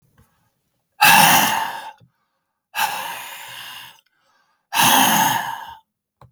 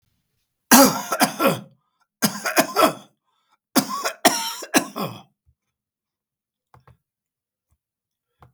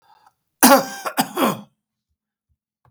{"exhalation_length": "6.3 s", "exhalation_amplitude": 32768, "exhalation_signal_mean_std_ratio": 0.45, "three_cough_length": "8.5 s", "three_cough_amplitude": 32768, "three_cough_signal_mean_std_ratio": 0.33, "cough_length": "2.9 s", "cough_amplitude": 32768, "cough_signal_mean_std_ratio": 0.32, "survey_phase": "beta (2021-08-13 to 2022-03-07)", "age": "65+", "gender": "Male", "wearing_mask": "No", "symptom_none": true, "smoker_status": "Ex-smoker", "respiratory_condition_asthma": false, "respiratory_condition_other": false, "recruitment_source": "REACT", "submission_delay": "2 days", "covid_test_result": "Negative", "covid_test_method": "RT-qPCR", "influenza_a_test_result": "Unknown/Void", "influenza_b_test_result": "Unknown/Void"}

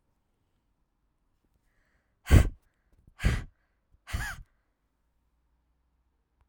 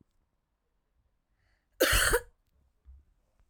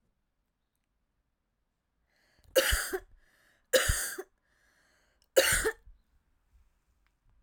{"exhalation_length": "6.5 s", "exhalation_amplitude": 16302, "exhalation_signal_mean_std_ratio": 0.19, "cough_length": "3.5 s", "cough_amplitude": 9867, "cough_signal_mean_std_ratio": 0.28, "three_cough_length": "7.4 s", "three_cough_amplitude": 12674, "three_cough_signal_mean_std_ratio": 0.29, "survey_phase": "alpha (2021-03-01 to 2021-08-12)", "age": "18-44", "gender": "Female", "wearing_mask": "No", "symptom_cough_any": true, "symptom_fatigue": true, "symptom_headache": true, "smoker_status": "Ex-smoker", "respiratory_condition_asthma": true, "respiratory_condition_other": false, "recruitment_source": "Test and Trace", "submission_delay": "2 days", "covid_test_result": "Positive", "covid_test_method": "RT-qPCR", "covid_ct_value": 31.3, "covid_ct_gene": "N gene", "covid_ct_mean": 31.5, "covid_viral_load": "46 copies/ml", "covid_viral_load_category": "Minimal viral load (< 10K copies/ml)"}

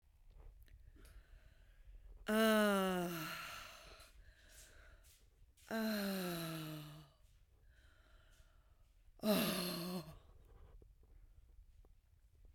{"exhalation_length": "12.5 s", "exhalation_amplitude": 2628, "exhalation_signal_mean_std_ratio": 0.46, "survey_phase": "beta (2021-08-13 to 2022-03-07)", "age": "45-64", "gender": "Female", "wearing_mask": "No", "symptom_cough_any": true, "symptom_runny_or_blocked_nose": true, "symptom_sore_throat": true, "symptom_diarrhoea": true, "symptom_fatigue": true, "symptom_headache": true, "symptom_change_to_sense_of_smell_or_taste": true, "symptom_loss_of_taste": true, "symptom_onset": "4 days", "smoker_status": "Current smoker (1 to 10 cigarettes per day)", "respiratory_condition_asthma": false, "respiratory_condition_other": false, "recruitment_source": "Test and Trace", "submission_delay": "2 days", "covid_test_result": "Positive", "covid_test_method": "RT-qPCR"}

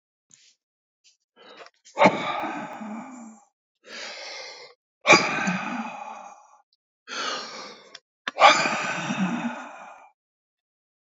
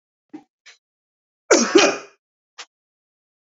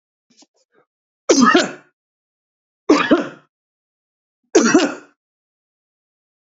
{"exhalation_length": "11.2 s", "exhalation_amplitude": 28202, "exhalation_signal_mean_std_ratio": 0.38, "cough_length": "3.6 s", "cough_amplitude": 29335, "cough_signal_mean_std_ratio": 0.27, "three_cough_length": "6.6 s", "three_cough_amplitude": 29858, "three_cough_signal_mean_std_ratio": 0.32, "survey_phase": "beta (2021-08-13 to 2022-03-07)", "age": "45-64", "gender": "Male", "wearing_mask": "No", "symptom_none": true, "smoker_status": "Ex-smoker", "respiratory_condition_asthma": false, "respiratory_condition_other": false, "recruitment_source": "REACT", "submission_delay": "3 days", "covid_test_result": "Negative", "covid_test_method": "RT-qPCR", "influenza_a_test_result": "Negative", "influenza_b_test_result": "Negative"}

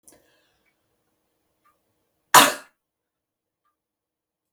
{"cough_length": "4.5 s", "cough_amplitude": 32768, "cough_signal_mean_std_ratio": 0.15, "survey_phase": "beta (2021-08-13 to 2022-03-07)", "age": "65+", "gender": "Female", "wearing_mask": "No", "symptom_none": true, "smoker_status": "Ex-smoker", "respiratory_condition_asthma": false, "respiratory_condition_other": false, "recruitment_source": "REACT", "submission_delay": "2 days", "covid_test_result": "Negative", "covid_test_method": "RT-qPCR", "influenza_a_test_result": "Negative", "influenza_b_test_result": "Negative"}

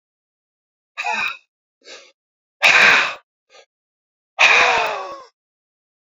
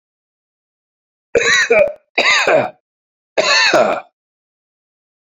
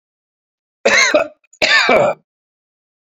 {"exhalation_length": "6.1 s", "exhalation_amplitude": 31082, "exhalation_signal_mean_std_ratio": 0.38, "three_cough_length": "5.2 s", "three_cough_amplitude": 29055, "three_cough_signal_mean_std_ratio": 0.48, "cough_length": "3.2 s", "cough_amplitude": 32768, "cough_signal_mean_std_ratio": 0.46, "survey_phase": "beta (2021-08-13 to 2022-03-07)", "age": "65+", "gender": "Male", "wearing_mask": "No", "symptom_none": true, "smoker_status": "Ex-smoker", "respiratory_condition_asthma": false, "respiratory_condition_other": false, "recruitment_source": "REACT", "submission_delay": "2 days", "covid_test_result": "Negative", "covid_test_method": "RT-qPCR"}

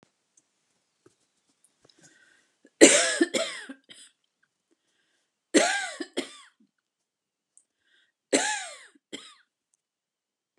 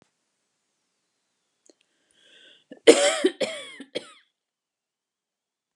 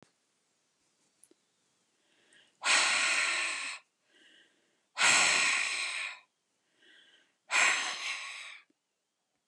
{"three_cough_length": "10.6 s", "three_cough_amplitude": 32767, "three_cough_signal_mean_std_ratio": 0.24, "cough_length": "5.8 s", "cough_amplitude": 32477, "cough_signal_mean_std_ratio": 0.21, "exhalation_length": "9.5 s", "exhalation_amplitude": 8223, "exhalation_signal_mean_std_ratio": 0.45, "survey_phase": "beta (2021-08-13 to 2022-03-07)", "age": "65+", "gender": "Female", "wearing_mask": "No", "symptom_none": true, "smoker_status": "Never smoked", "respiratory_condition_asthma": false, "respiratory_condition_other": false, "recruitment_source": "REACT", "submission_delay": "5 days", "covid_test_result": "Negative", "covid_test_method": "RT-qPCR"}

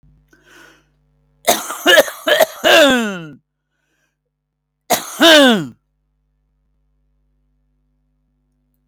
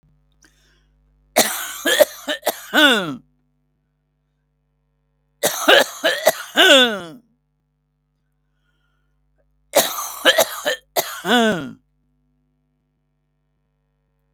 {"cough_length": "8.9 s", "cough_amplitude": 32768, "cough_signal_mean_std_ratio": 0.34, "three_cough_length": "14.3 s", "three_cough_amplitude": 32766, "three_cough_signal_mean_std_ratio": 0.35, "survey_phase": "beta (2021-08-13 to 2022-03-07)", "age": "45-64", "gender": "Male", "wearing_mask": "No", "symptom_none": true, "smoker_status": "Never smoked", "respiratory_condition_asthma": true, "respiratory_condition_other": false, "recruitment_source": "REACT", "submission_delay": "1 day", "covid_test_result": "Negative", "covid_test_method": "RT-qPCR", "covid_ct_value": 39.0, "covid_ct_gene": "N gene"}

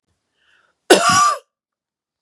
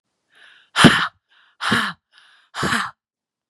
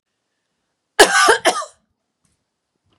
{"three_cough_length": "2.2 s", "three_cough_amplitude": 32768, "three_cough_signal_mean_std_ratio": 0.36, "exhalation_length": "3.5 s", "exhalation_amplitude": 32768, "exhalation_signal_mean_std_ratio": 0.35, "cough_length": "3.0 s", "cough_amplitude": 32768, "cough_signal_mean_std_ratio": 0.31, "survey_phase": "beta (2021-08-13 to 2022-03-07)", "age": "18-44", "gender": "Female", "wearing_mask": "No", "symptom_none": true, "smoker_status": "Never smoked", "respiratory_condition_asthma": false, "respiratory_condition_other": false, "recruitment_source": "REACT", "submission_delay": "7 days", "covid_test_result": "Negative", "covid_test_method": "RT-qPCR", "influenza_a_test_result": "Negative", "influenza_b_test_result": "Negative"}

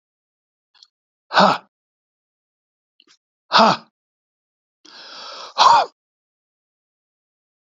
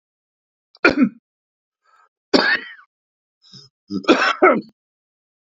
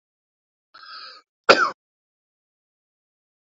{"exhalation_length": "7.8 s", "exhalation_amplitude": 32768, "exhalation_signal_mean_std_ratio": 0.25, "three_cough_length": "5.5 s", "three_cough_amplitude": 31153, "three_cough_signal_mean_std_ratio": 0.33, "cough_length": "3.6 s", "cough_amplitude": 28375, "cough_signal_mean_std_ratio": 0.18, "survey_phase": "beta (2021-08-13 to 2022-03-07)", "age": "65+", "gender": "Male", "wearing_mask": "No", "symptom_cough_any": true, "smoker_status": "Ex-smoker", "respiratory_condition_asthma": false, "respiratory_condition_other": false, "recruitment_source": "REACT", "submission_delay": "2 days", "covid_test_result": "Negative", "covid_test_method": "RT-qPCR", "influenza_a_test_result": "Negative", "influenza_b_test_result": "Negative"}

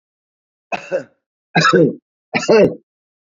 {"three_cough_length": "3.2 s", "three_cough_amplitude": 28625, "three_cough_signal_mean_std_ratio": 0.41, "survey_phase": "beta (2021-08-13 to 2022-03-07)", "age": "45-64", "gender": "Male", "wearing_mask": "No", "symptom_cough_any": true, "symptom_sore_throat": true, "symptom_onset": "7 days", "smoker_status": "Never smoked", "respiratory_condition_asthma": false, "respiratory_condition_other": false, "recruitment_source": "Test and Trace", "submission_delay": "2 days", "covid_test_result": "Positive", "covid_test_method": "RT-qPCR", "covid_ct_value": 18.0, "covid_ct_gene": "ORF1ab gene", "covid_ct_mean": 18.3, "covid_viral_load": "1000000 copies/ml", "covid_viral_load_category": "High viral load (>1M copies/ml)"}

